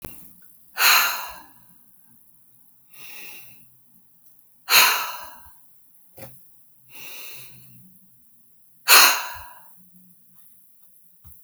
exhalation_length: 11.4 s
exhalation_amplitude: 32768
exhalation_signal_mean_std_ratio: 0.31
survey_phase: alpha (2021-03-01 to 2021-08-12)
age: 65+
gender: Female
wearing_mask: 'No'
symptom_none: true
smoker_status: Ex-smoker
respiratory_condition_asthma: false
respiratory_condition_other: false
recruitment_source: REACT
submission_delay: 2 days
covid_test_result: Negative
covid_test_method: RT-qPCR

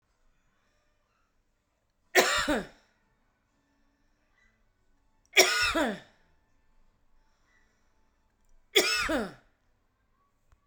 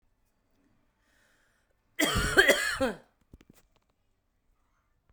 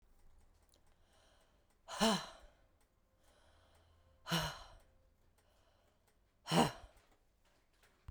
three_cough_length: 10.7 s
three_cough_amplitude: 21050
three_cough_signal_mean_std_ratio: 0.28
cough_length: 5.1 s
cough_amplitude: 17748
cough_signal_mean_std_ratio: 0.3
exhalation_length: 8.1 s
exhalation_amplitude: 4600
exhalation_signal_mean_std_ratio: 0.27
survey_phase: beta (2021-08-13 to 2022-03-07)
age: 45-64
gender: Female
wearing_mask: 'No'
symptom_new_continuous_cough: true
symptom_runny_or_blocked_nose: true
symptom_sore_throat: true
symptom_fatigue: true
symptom_fever_high_temperature: true
symptom_headache: true
symptom_onset: 4 days
smoker_status: Never smoked
respiratory_condition_asthma: false
respiratory_condition_other: false
recruitment_source: Test and Trace
submission_delay: 2 days
covid_test_result: Positive
covid_test_method: RT-qPCR
covid_ct_value: 27.7
covid_ct_gene: ORF1ab gene
covid_ct_mean: 27.7
covid_viral_load: 800 copies/ml
covid_viral_load_category: Minimal viral load (< 10K copies/ml)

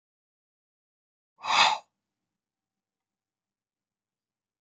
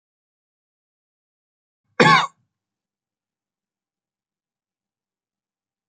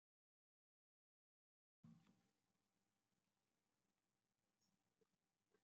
exhalation_length: 4.6 s
exhalation_amplitude: 14449
exhalation_signal_mean_std_ratio: 0.2
three_cough_length: 5.9 s
three_cough_amplitude: 27484
three_cough_signal_mean_std_ratio: 0.16
cough_length: 5.6 s
cough_amplitude: 46
cough_signal_mean_std_ratio: 0.28
survey_phase: beta (2021-08-13 to 2022-03-07)
age: 18-44
gender: Male
wearing_mask: 'No'
symptom_none: true
smoker_status: Never smoked
respiratory_condition_asthma: true
respiratory_condition_other: false
recruitment_source: REACT
submission_delay: 1 day
covid_test_result: Negative
covid_test_method: RT-qPCR
influenza_a_test_result: Negative
influenza_b_test_result: Negative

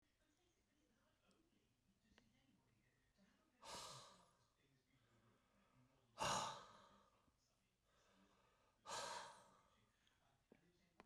exhalation_length: 11.1 s
exhalation_amplitude: 870
exhalation_signal_mean_std_ratio: 0.3
survey_phase: beta (2021-08-13 to 2022-03-07)
age: 65+
gender: Male
wearing_mask: 'No'
symptom_none: true
smoker_status: Never smoked
respiratory_condition_asthma: false
respiratory_condition_other: false
recruitment_source: REACT
covid_test_method: RT-qPCR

